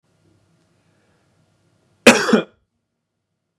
{"cough_length": "3.6 s", "cough_amplitude": 32768, "cough_signal_mean_std_ratio": 0.21, "survey_phase": "beta (2021-08-13 to 2022-03-07)", "age": "18-44", "gender": "Male", "wearing_mask": "No", "symptom_none": true, "symptom_onset": "11 days", "smoker_status": "Current smoker (1 to 10 cigarettes per day)", "respiratory_condition_asthma": false, "respiratory_condition_other": false, "recruitment_source": "REACT", "submission_delay": "8 days", "covid_test_result": "Negative", "covid_test_method": "RT-qPCR"}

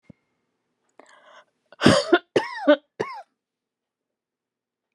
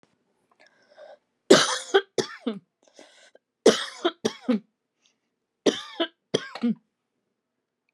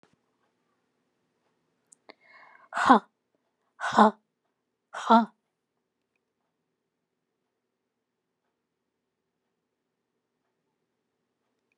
{"cough_length": "4.9 s", "cough_amplitude": 31507, "cough_signal_mean_std_ratio": 0.26, "three_cough_length": "7.9 s", "three_cough_amplitude": 30377, "three_cough_signal_mean_std_ratio": 0.29, "exhalation_length": "11.8 s", "exhalation_amplitude": 21956, "exhalation_signal_mean_std_ratio": 0.17, "survey_phase": "alpha (2021-03-01 to 2021-08-12)", "age": "65+", "gender": "Female", "wearing_mask": "No", "symptom_none": true, "smoker_status": "Ex-smoker", "respiratory_condition_asthma": false, "respiratory_condition_other": false, "recruitment_source": "REACT", "submission_delay": "1 day", "covid_test_result": "Negative", "covid_test_method": "RT-qPCR"}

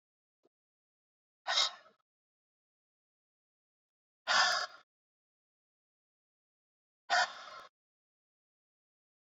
{"exhalation_length": "9.2 s", "exhalation_amplitude": 4943, "exhalation_signal_mean_std_ratio": 0.24, "survey_phase": "beta (2021-08-13 to 2022-03-07)", "age": "45-64", "gender": "Male", "wearing_mask": "No", "symptom_cough_any": true, "symptom_runny_or_blocked_nose": true, "symptom_sore_throat": true, "symptom_fatigue": true, "symptom_headache": true, "symptom_onset": "-1 day", "smoker_status": "Current smoker (1 to 10 cigarettes per day)", "respiratory_condition_asthma": false, "respiratory_condition_other": false, "recruitment_source": "Test and Trace", "submission_delay": "-3 days", "covid_test_result": "Positive", "covid_test_method": "ePCR"}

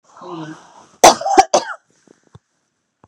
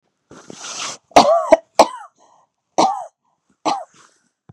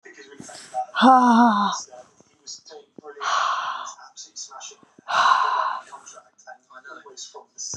{"cough_length": "3.1 s", "cough_amplitude": 32768, "cough_signal_mean_std_ratio": 0.29, "three_cough_length": "4.5 s", "three_cough_amplitude": 32768, "three_cough_signal_mean_std_ratio": 0.33, "exhalation_length": "7.8 s", "exhalation_amplitude": 25382, "exhalation_signal_mean_std_ratio": 0.46, "survey_phase": "beta (2021-08-13 to 2022-03-07)", "age": "45-64", "gender": "Female", "wearing_mask": "No", "symptom_none": true, "symptom_onset": "11 days", "smoker_status": "Ex-smoker", "respiratory_condition_asthma": false, "respiratory_condition_other": false, "recruitment_source": "REACT", "submission_delay": "2 days", "covid_test_result": "Negative", "covid_test_method": "RT-qPCR", "influenza_a_test_result": "Unknown/Void", "influenza_b_test_result": "Unknown/Void"}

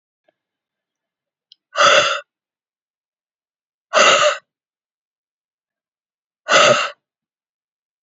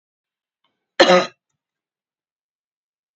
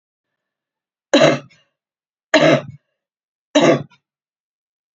{"exhalation_length": "8.0 s", "exhalation_amplitude": 31550, "exhalation_signal_mean_std_ratio": 0.31, "cough_length": "3.2 s", "cough_amplitude": 30885, "cough_signal_mean_std_ratio": 0.21, "three_cough_length": "4.9 s", "three_cough_amplitude": 32552, "three_cough_signal_mean_std_ratio": 0.32, "survey_phase": "beta (2021-08-13 to 2022-03-07)", "age": "45-64", "gender": "Female", "wearing_mask": "No", "symptom_cough_any": true, "symptom_runny_or_blocked_nose": true, "symptom_sore_throat": true, "symptom_abdominal_pain": true, "symptom_fever_high_temperature": true, "symptom_headache": true, "symptom_onset": "3 days", "smoker_status": "Never smoked", "respiratory_condition_asthma": false, "respiratory_condition_other": false, "recruitment_source": "Test and Trace", "submission_delay": "2 days", "covid_test_result": "Positive", "covid_test_method": "RT-qPCR", "covid_ct_value": 19.0, "covid_ct_gene": "N gene"}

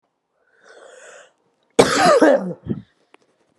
{"cough_length": "3.6 s", "cough_amplitude": 32768, "cough_signal_mean_std_ratio": 0.37, "survey_phase": "alpha (2021-03-01 to 2021-08-12)", "age": "45-64", "gender": "Female", "wearing_mask": "No", "symptom_fatigue": true, "symptom_change_to_sense_of_smell_or_taste": true, "symptom_onset": "2 days", "smoker_status": "Ex-smoker", "respiratory_condition_asthma": false, "respiratory_condition_other": false, "recruitment_source": "Test and Trace", "submission_delay": "1 day", "covid_test_result": "Positive", "covid_test_method": "RT-qPCR", "covid_ct_value": 14.0, "covid_ct_gene": "ORF1ab gene", "covid_ct_mean": 14.3, "covid_viral_load": "20000000 copies/ml", "covid_viral_load_category": "High viral load (>1M copies/ml)"}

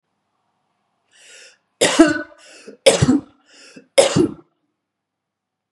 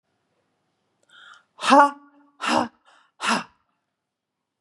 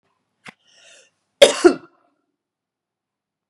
{"three_cough_length": "5.7 s", "three_cough_amplitude": 32768, "three_cough_signal_mean_std_ratio": 0.32, "exhalation_length": "4.6 s", "exhalation_amplitude": 27087, "exhalation_signal_mean_std_ratio": 0.28, "cough_length": "3.5 s", "cough_amplitude": 32768, "cough_signal_mean_std_ratio": 0.19, "survey_phase": "beta (2021-08-13 to 2022-03-07)", "age": "45-64", "gender": "Female", "wearing_mask": "No", "symptom_none": true, "smoker_status": "Never smoked", "respiratory_condition_asthma": false, "respiratory_condition_other": false, "recruitment_source": "Test and Trace", "submission_delay": "1 day", "covid_test_result": "Negative", "covid_test_method": "RT-qPCR"}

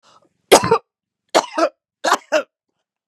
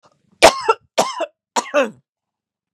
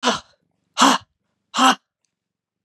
{"three_cough_length": "3.1 s", "three_cough_amplitude": 32768, "three_cough_signal_mean_std_ratio": 0.34, "cough_length": "2.7 s", "cough_amplitude": 32768, "cough_signal_mean_std_ratio": 0.33, "exhalation_length": "2.6 s", "exhalation_amplitude": 32387, "exhalation_signal_mean_std_ratio": 0.34, "survey_phase": "beta (2021-08-13 to 2022-03-07)", "age": "45-64", "gender": "Female", "wearing_mask": "No", "symptom_runny_or_blocked_nose": true, "smoker_status": "Ex-smoker", "respiratory_condition_asthma": true, "respiratory_condition_other": false, "recruitment_source": "REACT", "submission_delay": "6 days", "covid_test_result": "Negative", "covid_test_method": "RT-qPCR", "influenza_a_test_result": "Negative", "influenza_b_test_result": "Negative"}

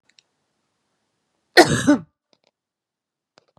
{"cough_length": "3.6 s", "cough_amplitude": 32768, "cough_signal_mean_std_ratio": 0.22, "survey_phase": "beta (2021-08-13 to 2022-03-07)", "age": "45-64", "gender": "Female", "wearing_mask": "No", "symptom_none": true, "smoker_status": "Never smoked", "respiratory_condition_asthma": false, "respiratory_condition_other": false, "recruitment_source": "REACT", "submission_delay": "2 days", "covid_test_result": "Negative", "covid_test_method": "RT-qPCR", "influenza_a_test_result": "Negative", "influenza_b_test_result": "Negative"}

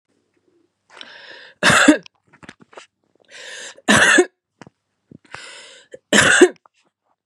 {"three_cough_length": "7.3 s", "three_cough_amplitude": 32768, "three_cough_signal_mean_std_ratio": 0.33, "survey_phase": "beta (2021-08-13 to 2022-03-07)", "age": "45-64", "gender": "Female", "wearing_mask": "No", "symptom_none": true, "smoker_status": "Never smoked", "respiratory_condition_asthma": true, "respiratory_condition_other": false, "recruitment_source": "REACT", "submission_delay": "2 days", "covid_test_result": "Negative", "covid_test_method": "RT-qPCR", "influenza_a_test_result": "Negative", "influenza_b_test_result": "Negative"}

